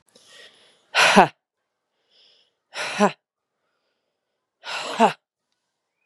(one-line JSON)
{"exhalation_length": "6.1 s", "exhalation_amplitude": 32767, "exhalation_signal_mean_std_ratio": 0.26, "survey_phase": "beta (2021-08-13 to 2022-03-07)", "age": "45-64", "gender": "Female", "wearing_mask": "Yes", "symptom_cough_any": true, "symptom_runny_or_blocked_nose": true, "symptom_diarrhoea": true, "symptom_fatigue": true, "symptom_headache": true, "symptom_change_to_sense_of_smell_or_taste": true, "smoker_status": "Never smoked", "respiratory_condition_asthma": false, "respiratory_condition_other": false, "recruitment_source": "Test and Trace", "submission_delay": "1 day", "covid_test_result": "Positive", "covid_test_method": "RT-qPCR", "covid_ct_value": 26.2, "covid_ct_gene": "ORF1ab gene", "covid_ct_mean": 26.8, "covid_viral_load": "1600 copies/ml", "covid_viral_load_category": "Minimal viral load (< 10K copies/ml)"}